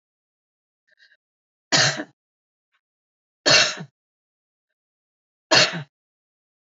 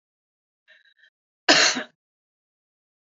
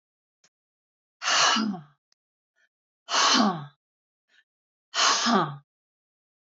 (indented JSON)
{
  "three_cough_length": "6.7 s",
  "three_cough_amplitude": 25564,
  "three_cough_signal_mean_std_ratio": 0.26,
  "cough_length": "3.1 s",
  "cough_amplitude": 26591,
  "cough_signal_mean_std_ratio": 0.24,
  "exhalation_length": "6.6 s",
  "exhalation_amplitude": 13976,
  "exhalation_signal_mean_std_ratio": 0.41,
  "survey_phase": "beta (2021-08-13 to 2022-03-07)",
  "age": "65+",
  "gender": "Female",
  "wearing_mask": "No",
  "symptom_none": true,
  "smoker_status": "Ex-smoker",
  "respiratory_condition_asthma": false,
  "respiratory_condition_other": false,
  "recruitment_source": "REACT",
  "submission_delay": "0 days",
  "covid_test_result": "Negative",
  "covid_test_method": "RT-qPCR",
  "influenza_a_test_result": "Negative",
  "influenza_b_test_result": "Negative"
}